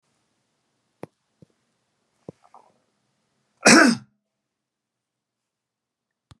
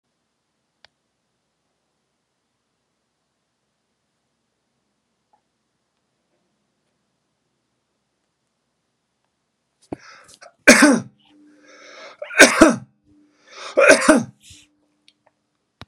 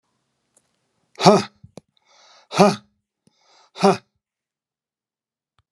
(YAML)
cough_length: 6.4 s
cough_amplitude: 30486
cough_signal_mean_std_ratio: 0.18
three_cough_length: 15.9 s
three_cough_amplitude: 32768
three_cough_signal_mean_std_ratio: 0.21
exhalation_length: 5.7 s
exhalation_amplitude: 32768
exhalation_signal_mean_std_ratio: 0.23
survey_phase: beta (2021-08-13 to 2022-03-07)
age: 65+
gender: Male
wearing_mask: 'No'
symptom_none: true
smoker_status: Never smoked
respiratory_condition_asthma: false
respiratory_condition_other: false
recruitment_source: REACT
submission_delay: 1 day
covid_test_result: Negative
covid_test_method: RT-qPCR